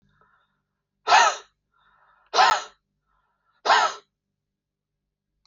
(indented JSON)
{
  "exhalation_length": "5.5 s",
  "exhalation_amplitude": 19874,
  "exhalation_signal_mean_std_ratio": 0.3,
  "survey_phase": "alpha (2021-03-01 to 2021-08-12)",
  "age": "45-64",
  "gender": "Male",
  "wearing_mask": "No",
  "symptom_none": true,
  "smoker_status": "Never smoked",
  "respiratory_condition_asthma": false,
  "respiratory_condition_other": false,
  "recruitment_source": "REACT",
  "submission_delay": "1 day",
  "covid_test_result": "Negative",
  "covid_test_method": "RT-qPCR"
}